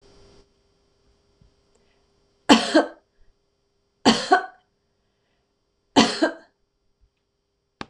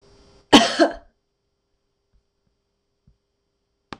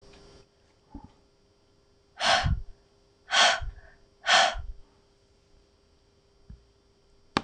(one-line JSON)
{"three_cough_length": "7.9 s", "three_cough_amplitude": 26028, "three_cough_signal_mean_std_ratio": 0.25, "cough_length": "4.0 s", "cough_amplitude": 26028, "cough_signal_mean_std_ratio": 0.21, "exhalation_length": "7.4 s", "exhalation_amplitude": 17847, "exhalation_signal_mean_std_ratio": 0.33, "survey_phase": "beta (2021-08-13 to 2022-03-07)", "age": "65+", "gender": "Female", "wearing_mask": "No", "symptom_none": true, "smoker_status": "Never smoked", "respiratory_condition_asthma": false, "respiratory_condition_other": false, "recruitment_source": "REACT", "submission_delay": "3 days", "covid_test_result": "Negative", "covid_test_method": "RT-qPCR"}